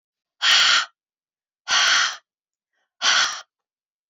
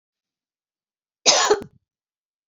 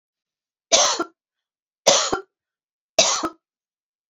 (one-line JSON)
{"exhalation_length": "4.1 s", "exhalation_amplitude": 26298, "exhalation_signal_mean_std_ratio": 0.45, "cough_length": "2.5 s", "cough_amplitude": 29489, "cough_signal_mean_std_ratio": 0.28, "three_cough_length": "4.1 s", "three_cough_amplitude": 31931, "three_cough_signal_mean_std_ratio": 0.35, "survey_phase": "beta (2021-08-13 to 2022-03-07)", "age": "18-44", "gender": "Female", "wearing_mask": "No", "symptom_cough_any": true, "smoker_status": "Never smoked", "respiratory_condition_asthma": false, "respiratory_condition_other": false, "recruitment_source": "REACT", "submission_delay": "2 days", "covid_test_result": "Negative", "covid_test_method": "RT-qPCR"}